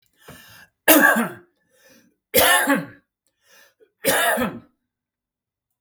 {"three_cough_length": "5.8 s", "three_cough_amplitude": 32768, "three_cough_signal_mean_std_ratio": 0.39, "survey_phase": "beta (2021-08-13 to 2022-03-07)", "age": "65+", "gender": "Male", "wearing_mask": "No", "symptom_none": true, "smoker_status": "Ex-smoker", "respiratory_condition_asthma": false, "respiratory_condition_other": false, "recruitment_source": "REACT", "submission_delay": "2 days", "covid_test_result": "Negative", "covid_test_method": "RT-qPCR", "influenza_a_test_result": "Negative", "influenza_b_test_result": "Negative"}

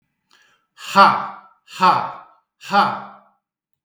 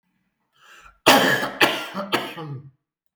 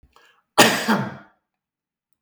{"exhalation_length": "3.8 s", "exhalation_amplitude": 32766, "exhalation_signal_mean_std_ratio": 0.38, "three_cough_length": "3.2 s", "three_cough_amplitude": 32766, "three_cough_signal_mean_std_ratio": 0.42, "cough_length": "2.2 s", "cough_amplitude": 32767, "cough_signal_mean_std_ratio": 0.33, "survey_phase": "beta (2021-08-13 to 2022-03-07)", "age": "45-64", "gender": "Male", "wearing_mask": "No", "symptom_none": true, "smoker_status": "Never smoked", "respiratory_condition_asthma": false, "respiratory_condition_other": false, "recruitment_source": "REACT", "submission_delay": "2 days", "covid_test_result": "Negative", "covid_test_method": "RT-qPCR", "influenza_a_test_result": "Negative", "influenza_b_test_result": "Negative"}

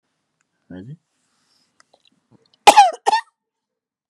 {"cough_length": "4.1 s", "cough_amplitude": 32768, "cough_signal_mean_std_ratio": 0.22, "survey_phase": "beta (2021-08-13 to 2022-03-07)", "age": "45-64", "gender": "Female", "wearing_mask": "No", "symptom_none": true, "smoker_status": "Never smoked", "respiratory_condition_asthma": false, "respiratory_condition_other": false, "recruitment_source": "REACT", "submission_delay": "1 day", "covid_test_result": "Negative", "covid_test_method": "RT-qPCR", "influenza_a_test_result": "Negative", "influenza_b_test_result": "Negative"}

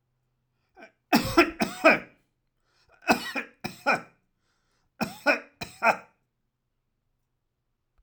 {"cough_length": "8.0 s", "cough_amplitude": 18250, "cough_signal_mean_std_ratio": 0.3, "survey_phase": "alpha (2021-03-01 to 2021-08-12)", "age": "65+", "gender": "Male", "wearing_mask": "No", "symptom_none": true, "smoker_status": "Ex-smoker", "respiratory_condition_asthma": false, "respiratory_condition_other": false, "recruitment_source": "REACT", "submission_delay": "3 days", "covid_test_result": "Negative", "covid_test_method": "RT-qPCR"}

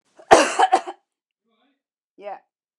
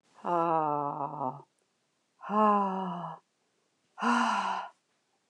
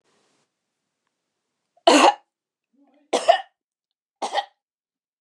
{"cough_length": "2.8 s", "cough_amplitude": 29204, "cough_signal_mean_std_ratio": 0.29, "exhalation_length": "5.3 s", "exhalation_amplitude": 8120, "exhalation_signal_mean_std_ratio": 0.53, "three_cough_length": "5.2 s", "three_cough_amplitude": 28916, "three_cough_signal_mean_std_ratio": 0.25, "survey_phase": "beta (2021-08-13 to 2022-03-07)", "age": "65+", "gender": "Female", "wearing_mask": "No", "symptom_none": true, "smoker_status": "Ex-smoker", "respiratory_condition_asthma": false, "respiratory_condition_other": false, "recruitment_source": "REACT", "submission_delay": "2 days", "covid_test_result": "Negative", "covid_test_method": "RT-qPCR"}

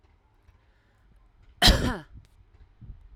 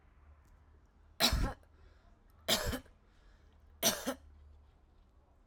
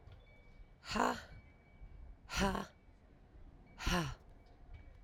{"cough_length": "3.2 s", "cough_amplitude": 21747, "cough_signal_mean_std_ratio": 0.26, "three_cough_length": "5.5 s", "three_cough_amplitude": 6893, "three_cough_signal_mean_std_ratio": 0.36, "exhalation_length": "5.0 s", "exhalation_amplitude": 4370, "exhalation_signal_mean_std_ratio": 0.45, "survey_phase": "alpha (2021-03-01 to 2021-08-12)", "age": "18-44", "gender": "Female", "wearing_mask": "No", "symptom_none": true, "symptom_onset": "6 days", "smoker_status": "Current smoker (11 or more cigarettes per day)", "respiratory_condition_asthma": false, "respiratory_condition_other": false, "recruitment_source": "REACT", "submission_delay": "1 day", "covid_test_result": "Negative", "covid_test_method": "RT-qPCR"}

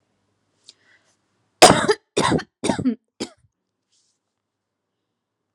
{"cough_length": "5.5 s", "cough_amplitude": 32768, "cough_signal_mean_std_ratio": 0.26, "survey_phase": "alpha (2021-03-01 to 2021-08-12)", "age": "18-44", "gender": "Female", "wearing_mask": "No", "symptom_abdominal_pain": true, "smoker_status": "Ex-smoker", "respiratory_condition_asthma": true, "respiratory_condition_other": false, "recruitment_source": "REACT", "submission_delay": "1 day", "covid_test_result": "Negative", "covid_test_method": "RT-qPCR"}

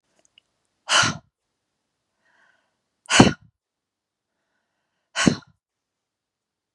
{"exhalation_length": "6.7 s", "exhalation_amplitude": 32768, "exhalation_signal_mean_std_ratio": 0.21, "survey_phase": "beta (2021-08-13 to 2022-03-07)", "age": "45-64", "gender": "Female", "wearing_mask": "No", "symptom_runny_or_blocked_nose": true, "symptom_onset": "8 days", "smoker_status": "Never smoked", "respiratory_condition_asthma": false, "respiratory_condition_other": false, "recruitment_source": "REACT", "submission_delay": "3 days", "covid_test_result": "Negative", "covid_test_method": "RT-qPCR", "influenza_a_test_result": "Negative", "influenza_b_test_result": "Negative"}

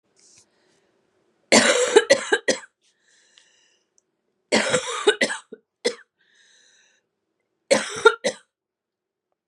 {"three_cough_length": "9.5 s", "three_cough_amplitude": 32767, "three_cough_signal_mean_std_ratio": 0.32, "survey_phase": "beta (2021-08-13 to 2022-03-07)", "age": "45-64", "gender": "Female", "wearing_mask": "No", "symptom_cough_any": true, "symptom_runny_or_blocked_nose": true, "symptom_sore_throat": true, "symptom_change_to_sense_of_smell_or_taste": true, "symptom_loss_of_taste": true, "symptom_onset": "3 days", "smoker_status": "Ex-smoker", "respiratory_condition_asthma": false, "respiratory_condition_other": false, "recruitment_source": "Test and Trace", "submission_delay": "2 days", "covid_test_result": "Positive", "covid_test_method": "RT-qPCR", "covid_ct_value": 16.6, "covid_ct_gene": "ORF1ab gene", "covid_ct_mean": 16.8, "covid_viral_load": "3000000 copies/ml", "covid_viral_load_category": "High viral load (>1M copies/ml)"}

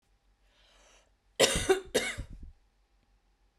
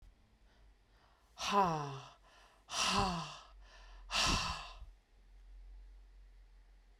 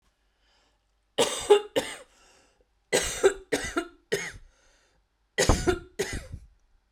{"cough_length": "3.6 s", "cough_amplitude": 11022, "cough_signal_mean_std_ratio": 0.32, "exhalation_length": "7.0 s", "exhalation_amplitude": 4302, "exhalation_signal_mean_std_ratio": 0.46, "three_cough_length": "6.9 s", "three_cough_amplitude": 21540, "three_cough_signal_mean_std_ratio": 0.37, "survey_phase": "beta (2021-08-13 to 2022-03-07)", "age": "18-44", "gender": "Female", "wearing_mask": "No", "symptom_none": true, "smoker_status": "Ex-smoker", "respiratory_condition_asthma": false, "respiratory_condition_other": false, "recruitment_source": "REACT", "submission_delay": "2 days", "covid_test_result": "Negative", "covid_test_method": "RT-qPCR"}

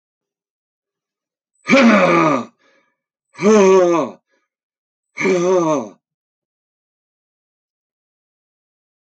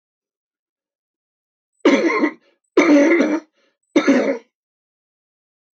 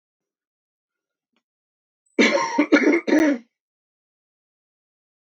{"exhalation_length": "9.1 s", "exhalation_amplitude": 32047, "exhalation_signal_mean_std_ratio": 0.39, "three_cough_length": "5.8 s", "three_cough_amplitude": 26182, "three_cough_signal_mean_std_ratio": 0.41, "cough_length": "5.3 s", "cough_amplitude": 24580, "cough_signal_mean_std_ratio": 0.35, "survey_phase": "alpha (2021-03-01 to 2021-08-12)", "age": "65+", "gender": "Male", "wearing_mask": "No", "symptom_none": true, "smoker_status": "Ex-smoker", "respiratory_condition_asthma": false, "respiratory_condition_other": false, "recruitment_source": "REACT", "submission_delay": "2 days", "covid_test_result": "Negative", "covid_test_method": "RT-qPCR"}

